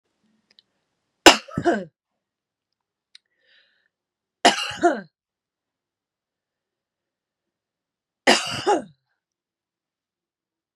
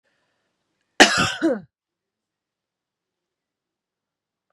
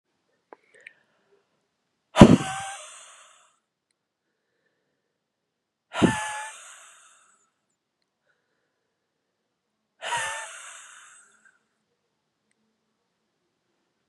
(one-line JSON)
{"three_cough_length": "10.8 s", "three_cough_amplitude": 32768, "three_cough_signal_mean_std_ratio": 0.21, "cough_length": "4.5 s", "cough_amplitude": 32768, "cough_signal_mean_std_ratio": 0.22, "exhalation_length": "14.1 s", "exhalation_amplitude": 32768, "exhalation_signal_mean_std_ratio": 0.16, "survey_phase": "beta (2021-08-13 to 2022-03-07)", "age": "45-64", "gender": "Female", "wearing_mask": "No", "symptom_none": true, "smoker_status": "Never smoked", "respiratory_condition_asthma": true, "respiratory_condition_other": false, "recruitment_source": "REACT", "submission_delay": "2 days", "covid_test_result": "Negative", "covid_test_method": "RT-qPCR", "influenza_a_test_result": "Negative", "influenza_b_test_result": "Negative"}